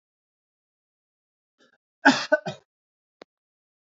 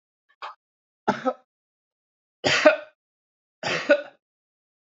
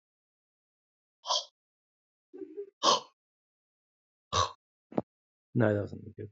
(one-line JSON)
{"cough_length": "3.9 s", "cough_amplitude": 25561, "cough_signal_mean_std_ratio": 0.18, "three_cough_length": "4.9 s", "three_cough_amplitude": 32767, "three_cough_signal_mean_std_ratio": 0.29, "exhalation_length": "6.3 s", "exhalation_amplitude": 9852, "exhalation_signal_mean_std_ratio": 0.3, "survey_phase": "beta (2021-08-13 to 2022-03-07)", "age": "18-44", "gender": "Male", "wearing_mask": "No", "symptom_none": true, "smoker_status": "Never smoked", "respiratory_condition_asthma": false, "respiratory_condition_other": false, "recruitment_source": "REACT", "submission_delay": "2 days", "covid_test_result": "Negative", "covid_test_method": "RT-qPCR"}